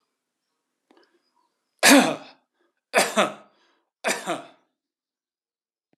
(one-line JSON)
{"three_cough_length": "6.0 s", "three_cough_amplitude": 25801, "three_cough_signal_mean_std_ratio": 0.27, "survey_phase": "alpha (2021-03-01 to 2021-08-12)", "age": "65+", "gender": "Male", "wearing_mask": "No", "symptom_none": true, "smoker_status": "Never smoked", "respiratory_condition_asthma": false, "respiratory_condition_other": false, "recruitment_source": "REACT", "submission_delay": "2 days", "covid_test_result": "Negative", "covid_test_method": "RT-qPCR"}